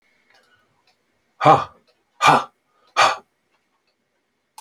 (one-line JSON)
{"exhalation_length": "4.6 s", "exhalation_amplitude": 31206, "exhalation_signal_mean_std_ratio": 0.28, "survey_phase": "alpha (2021-03-01 to 2021-08-12)", "age": "65+", "gender": "Male", "wearing_mask": "No", "symptom_none": true, "smoker_status": "Ex-smoker", "respiratory_condition_asthma": false, "respiratory_condition_other": false, "recruitment_source": "REACT", "submission_delay": "2 days", "covid_test_result": "Negative", "covid_test_method": "RT-qPCR"}